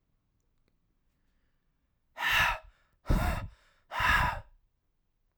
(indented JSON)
{
  "exhalation_length": "5.4 s",
  "exhalation_amplitude": 6826,
  "exhalation_signal_mean_std_ratio": 0.39,
  "survey_phase": "alpha (2021-03-01 to 2021-08-12)",
  "age": "18-44",
  "gender": "Male",
  "wearing_mask": "No",
  "symptom_none": true,
  "symptom_cough_any": true,
  "symptom_headache": true,
  "smoker_status": "Current smoker (1 to 10 cigarettes per day)",
  "respiratory_condition_asthma": false,
  "respiratory_condition_other": false,
  "recruitment_source": "REACT",
  "submission_delay": "1 day",
  "covid_test_result": "Negative",
  "covid_test_method": "RT-qPCR"
}